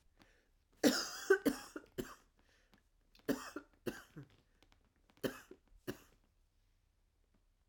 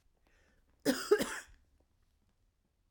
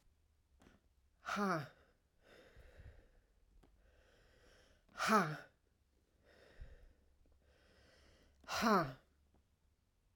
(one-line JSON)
{"three_cough_length": "7.7 s", "three_cough_amplitude": 5318, "three_cough_signal_mean_std_ratio": 0.27, "cough_length": "2.9 s", "cough_amplitude": 5675, "cough_signal_mean_std_ratio": 0.28, "exhalation_length": "10.2 s", "exhalation_amplitude": 3182, "exhalation_signal_mean_std_ratio": 0.3, "survey_phase": "alpha (2021-03-01 to 2021-08-12)", "age": "45-64", "gender": "Female", "wearing_mask": "No", "symptom_cough_any": true, "symptom_fatigue": true, "symptom_change_to_sense_of_smell_or_taste": true, "symptom_loss_of_taste": true, "smoker_status": "Never smoked", "respiratory_condition_asthma": false, "respiratory_condition_other": false, "recruitment_source": "Test and Trace", "submission_delay": "2 days", "covid_test_result": "Positive", "covid_test_method": "RT-qPCR"}